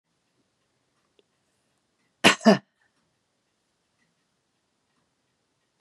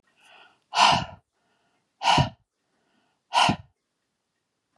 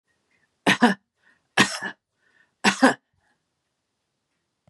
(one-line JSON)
{"cough_length": "5.8 s", "cough_amplitude": 32643, "cough_signal_mean_std_ratio": 0.14, "exhalation_length": "4.8 s", "exhalation_amplitude": 19173, "exhalation_signal_mean_std_ratio": 0.32, "three_cough_length": "4.7 s", "three_cough_amplitude": 26037, "three_cough_signal_mean_std_ratio": 0.27, "survey_phase": "beta (2021-08-13 to 2022-03-07)", "age": "65+", "gender": "Female", "wearing_mask": "No", "symptom_none": true, "smoker_status": "Ex-smoker", "respiratory_condition_asthma": false, "respiratory_condition_other": false, "recruitment_source": "REACT", "submission_delay": "2 days", "covid_test_result": "Negative", "covid_test_method": "RT-qPCR", "influenza_a_test_result": "Negative", "influenza_b_test_result": "Negative"}